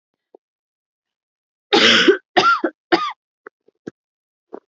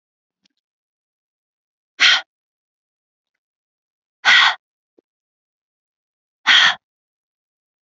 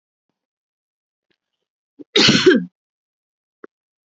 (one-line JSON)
{"three_cough_length": "4.7 s", "three_cough_amplitude": 30069, "three_cough_signal_mean_std_ratio": 0.35, "exhalation_length": "7.9 s", "exhalation_amplitude": 30376, "exhalation_signal_mean_std_ratio": 0.24, "cough_length": "4.1 s", "cough_amplitude": 29726, "cough_signal_mean_std_ratio": 0.27, "survey_phase": "alpha (2021-03-01 to 2021-08-12)", "age": "18-44", "gender": "Female", "wearing_mask": "No", "symptom_none": true, "smoker_status": "Never smoked", "respiratory_condition_asthma": true, "respiratory_condition_other": false, "recruitment_source": "REACT", "submission_delay": "1 day", "covid_test_result": "Negative", "covid_test_method": "RT-qPCR"}